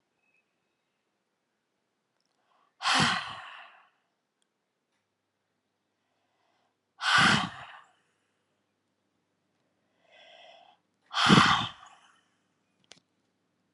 {"exhalation_length": "13.7 s", "exhalation_amplitude": 16741, "exhalation_signal_mean_std_ratio": 0.25, "survey_phase": "alpha (2021-03-01 to 2021-08-12)", "age": "45-64", "gender": "Female", "wearing_mask": "No", "symptom_none": true, "smoker_status": "Ex-smoker", "respiratory_condition_asthma": false, "respiratory_condition_other": false, "recruitment_source": "REACT", "submission_delay": "1 day", "covid_test_result": "Negative", "covid_test_method": "RT-qPCR"}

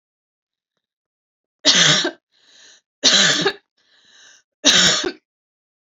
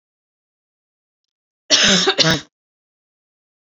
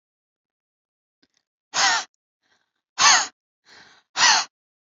{"three_cough_length": "5.9 s", "three_cough_amplitude": 32768, "three_cough_signal_mean_std_ratio": 0.39, "cough_length": "3.7 s", "cough_amplitude": 32767, "cough_signal_mean_std_ratio": 0.33, "exhalation_length": "4.9 s", "exhalation_amplitude": 25074, "exhalation_signal_mean_std_ratio": 0.32, "survey_phase": "alpha (2021-03-01 to 2021-08-12)", "age": "18-44", "gender": "Female", "wearing_mask": "No", "symptom_none": true, "smoker_status": "Ex-smoker", "respiratory_condition_asthma": false, "respiratory_condition_other": false, "recruitment_source": "REACT", "submission_delay": "2 days", "covid_test_result": "Negative", "covid_test_method": "RT-qPCR"}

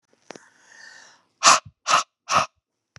{"exhalation_length": "3.0 s", "exhalation_amplitude": 30438, "exhalation_signal_mean_std_ratio": 0.3, "survey_phase": "beta (2021-08-13 to 2022-03-07)", "age": "45-64", "gender": "Male", "wearing_mask": "No", "symptom_none": true, "smoker_status": "Never smoked", "respiratory_condition_asthma": false, "respiratory_condition_other": false, "recruitment_source": "REACT", "submission_delay": "2 days", "covid_test_result": "Negative", "covid_test_method": "RT-qPCR", "influenza_a_test_result": "Negative", "influenza_b_test_result": "Negative"}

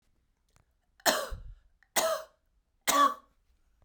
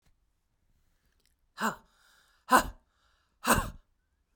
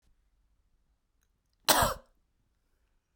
{"three_cough_length": "3.8 s", "three_cough_amplitude": 11442, "three_cough_signal_mean_std_ratio": 0.36, "exhalation_length": "4.4 s", "exhalation_amplitude": 16238, "exhalation_signal_mean_std_ratio": 0.24, "cough_length": "3.2 s", "cough_amplitude": 15732, "cough_signal_mean_std_ratio": 0.22, "survey_phase": "beta (2021-08-13 to 2022-03-07)", "age": "45-64", "gender": "Female", "wearing_mask": "No", "symptom_headache": true, "symptom_onset": "13 days", "smoker_status": "Never smoked", "respiratory_condition_asthma": false, "respiratory_condition_other": false, "recruitment_source": "REACT", "submission_delay": "4 days", "covid_test_result": "Negative", "covid_test_method": "RT-qPCR"}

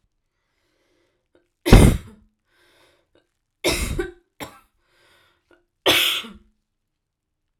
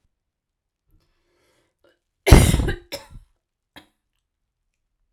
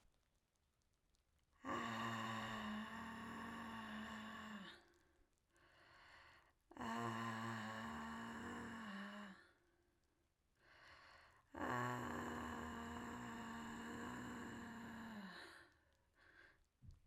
{"three_cough_length": "7.6 s", "three_cough_amplitude": 32768, "three_cough_signal_mean_std_ratio": 0.25, "cough_length": "5.1 s", "cough_amplitude": 32768, "cough_signal_mean_std_ratio": 0.21, "exhalation_length": "17.1 s", "exhalation_amplitude": 983, "exhalation_signal_mean_std_ratio": 0.74, "survey_phase": "alpha (2021-03-01 to 2021-08-12)", "age": "18-44", "gender": "Female", "wearing_mask": "No", "symptom_shortness_of_breath": true, "symptom_diarrhoea": true, "symptom_fatigue": true, "symptom_fever_high_temperature": true, "symptom_loss_of_taste": true, "symptom_onset": "2 days", "smoker_status": "Ex-smoker", "respiratory_condition_asthma": false, "respiratory_condition_other": false, "recruitment_source": "Test and Trace", "submission_delay": "2 days", "covid_test_result": "Positive", "covid_test_method": "RT-qPCR", "covid_ct_value": 34.2, "covid_ct_gene": "N gene"}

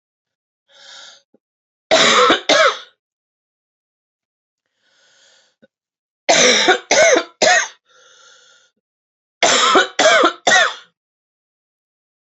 {"three_cough_length": "12.4 s", "three_cough_amplitude": 32767, "three_cough_signal_mean_std_ratio": 0.41, "survey_phase": "beta (2021-08-13 to 2022-03-07)", "age": "45-64", "gender": "Female", "wearing_mask": "No", "symptom_new_continuous_cough": true, "symptom_runny_or_blocked_nose": true, "symptom_headache": true, "symptom_onset": "3 days", "smoker_status": "Never smoked", "respiratory_condition_asthma": false, "respiratory_condition_other": false, "recruitment_source": "Test and Trace", "submission_delay": "2 days", "covid_test_result": "Positive", "covid_test_method": "RT-qPCR", "covid_ct_value": 13.6, "covid_ct_gene": "S gene", "covid_ct_mean": 14.0, "covid_viral_load": "26000000 copies/ml", "covid_viral_load_category": "High viral load (>1M copies/ml)"}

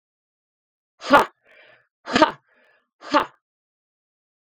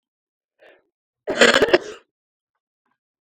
{"exhalation_length": "4.6 s", "exhalation_amplitude": 32768, "exhalation_signal_mean_std_ratio": 0.23, "cough_length": "3.3 s", "cough_amplitude": 32768, "cough_signal_mean_std_ratio": 0.27, "survey_phase": "beta (2021-08-13 to 2022-03-07)", "age": "45-64", "gender": "Female", "wearing_mask": "No", "symptom_none": true, "smoker_status": "Never smoked", "respiratory_condition_asthma": false, "respiratory_condition_other": false, "recruitment_source": "REACT", "submission_delay": "4 days", "covid_test_result": "Negative", "covid_test_method": "RT-qPCR", "influenza_a_test_result": "Negative", "influenza_b_test_result": "Negative"}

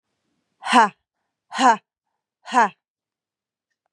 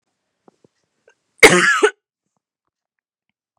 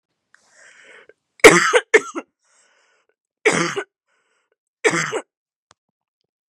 {"exhalation_length": "3.9 s", "exhalation_amplitude": 26746, "exhalation_signal_mean_std_ratio": 0.29, "cough_length": "3.6 s", "cough_amplitude": 32768, "cough_signal_mean_std_ratio": 0.25, "three_cough_length": "6.5 s", "three_cough_amplitude": 32768, "three_cough_signal_mean_std_ratio": 0.26, "survey_phase": "beta (2021-08-13 to 2022-03-07)", "age": "18-44", "gender": "Female", "wearing_mask": "No", "symptom_cough_any": true, "symptom_fatigue": true, "smoker_status": "Ex-smoker", "respiratory_condition_asthma": false, "respiratory_condition_other": false, "recruitment_source": "REACT", "submission_delay": "2 days", "covid_test_result": "Positive", "covid_test_method": "RT-qPCR", "covid_ct_value": 34.0, "covid_ct_gene": "N gene", "influenza_a_test_result": "Negative", "influenza_b_test_result": "Negative"}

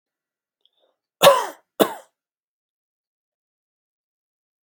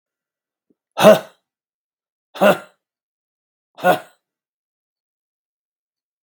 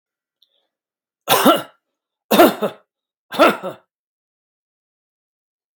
{"cough_length": "4.6 s", "cough_amplitude": 32768, "cough_signal_mean_std_ratio": 0.18, "exhalation_length": "6.2 s", "exhalation_amplitude": 32768, "exhalation_signal_mean_std_ratio": 0.21, "three_cough_length": "5.8 s", "three_cough_amplitude": 32768, "three_cough_signal_mean_std_ratio": 0.29, "survey_phase": "beta (2021-08-13 to 2022-03-07)", "age": "65+", "gender": "Male", "wearing_mask": "No", "symptom_none": true, "smoker_status": "Never smoked", "respiratory_condition_asthma": false, "respiratory_condition_other": false, "recruitment_source": "REACT", "submission_delay": "1 day", "covid_test_result": "Negative", "covid_test_method": "RT-qPCR"}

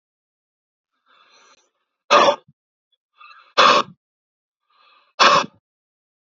{"exhalation_length": "6.4 s", "exhalation_amplitude": 28941, "exhalation_signal_mean_std_ratio": 0.27, "survey_phase": "alpha (2021-03-01 to 2021-08-12)", "age": "18-44", "gender": "Male", "wearing_mask": "No", "symptom_cough_any": true, "symptom_headache": true, "symptom_onset": "4 days", "smoker_status": "Never smoked", "respiratory_condition_asthma": true, "respiratory_condition_other": false, "recruitment_source": "Test and Trace", "submission_delay": "2 days", "covid_test_result": "Positive", "covid_test_method": "RT-qPCR", "covid_ct_value": 12.7, "covid_ct_gene": "ORF1ab gene"}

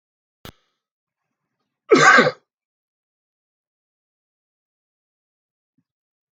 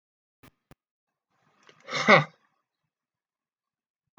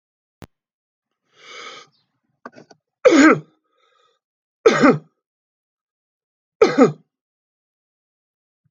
{"cough_length": "6.3 s", "cough_amplitude": 29817, "cough_signal_mean_std_ratio": 0.2, "exhalation_length": "4.2 s", "exhalation_amplitude": 26485, "exhalation_signal_mean_std_ratio": 0.18, "three_cough_length": "8.7 s", "three_cough_amplitude": 32655, "three_cough_signal_mean_std_ratio": 0.25, "survey_phase": "alpha (2021-03-01 to 2021-08-12)", "age": "65+", "gender": "Male", "wearing_mask": "No", "symptom_none": true, "smoker_status": "Ex-smoker", "respiratory_condition_asthma": false, "respiratory_condition_other": false, "recruitment_source": "REACT", "submission_delay": "1 day", "covid_test_result": "Negative", "covid_test_method": "RT-qPCR"}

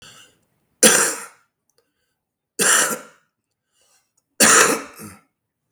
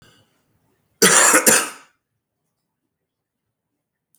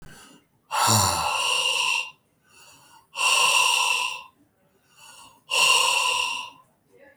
{"three_cough_length": "5.7 s", "three_cough_amplitude": 32768, "three_cough_signal_mean_std_ratio": 0.35, "cough_length": "4.2 s", "cough_amplitude": 32768, "cough_signal_mean_std_ratio": 0.31, "exhalation_length": "7.2 s", "exhalation_amplitude": 15257, "exhalation_signal_mean_std_ratio": 0.62, "survey_phase": "beta (2021-08-13 to 2022-03-07)", "age": "45-64", "gender": "Male", "wearing_mask": "No", "symptom_cough_any": true, "symptom_runny_or_blocked_nose": true, "symptom_shortness_of_breath": true, "symptom_fatigue": true, "symptom_fever_high_temperature": true, "symptom_headache": true, "symptom_change_to_sense_of_smell_or_taste": true, "symptom_onset": "2 days", "smoker_status": "Current smoker (e-cigarettes or vapes only)", "respiratory_condition_asthma": false, "respiratory_condition_other": false, "recruitment_source": "Test and Trace", "submission_delay": "2 days", "covid_test_result": "Positive", "covid_test_method": "RT-qPCR", "covid_ct_value": 23.5, "covid_ct_gene": "ORF1ab gene", "covid_ct_mean": 24.1, "covid_viral_load": "12000 copies/ml", "covid_viral_load_category": "Low viral load (10K-1M copies/ml)"}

